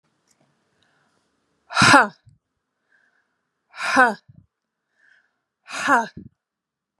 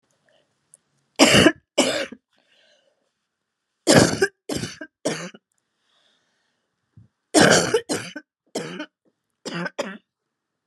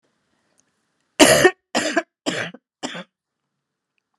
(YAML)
exhalation_length: 7.0 s
exhalation_amplitude: 32766
exhalation_signal_mean_std_ratio: 0.26
three_cough_length: 10.7 s
three_cough_amplitude: 32753
three_cough_signal_mean_std_ratio: 0.32
cough_length: 4.2 s
cough_amplitude: 32767
cough_signal_mean_std_ratio: 0.3
survey_phase: beta (2021-08-13 to 2022-03-07)
age: 45-64
gender: Female
wearing_mask: 'No'
symptom_cough_any: true
symptom_new_continuous_cough: true
symptom_runny_or_blocked_nose: true
symptom_sore_throat: true
symptom_headache: true
symptom_change_to_sense_of_smell_or_taste: true
smoker_status: Never smoked
respiratory_condition_asthma: false
respiratory_condition_other: false
recruitment_source: Test and Trace
submission_delay: 2 days
covid_test_result: Positive
covid_test_method: RT-qPCR
covid_ct_value: 28.5
covid_ct_gene: ORF1ab gene
covid_ct_mean: 29.2
covid_viral_load: 270 copies/ml
covid_viral_load_category: Minimal viral load (< 10K copies/ml)